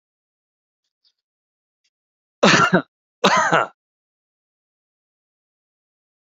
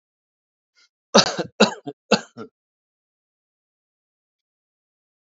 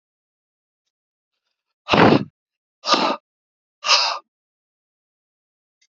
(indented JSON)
{
  "cough_length": "6.3 s",
  "cough_amplitude": 29570,
  "cough_signal_mean_std_ratio": 0.27,
  "three_cough_length": "5.3 s",
  "three_cough_amplitude": 32109,
  "three_cough_signal_mean_std_ratio": 0.2,
  "exhalation_length": "5.9 s",
  "exhalation_amplitude": 30898,
  "exhalation_signal_mean_std_ratio": 0.29,
  "survey_phase": "beta (2021-08-13 to 2022-03-07)",
  "age": "45-64",
  "gender": "Male",
  "wearing_mask": "No",
  "symptom_none": true,
  "smoker_status": "Ex-smoker",
  "respiratory_condition_asthma": false,
  "respiratory_condition_other": false,
  "recruitment_source": "REACT",
  "submission_delay": "6 days",
  "covid_test_result": "Negative",
  "covid_test_method": "RT-qPCR",
  "influenza_a_test_result": "Negative",
  "influenza_b_test_result": "Negative"
}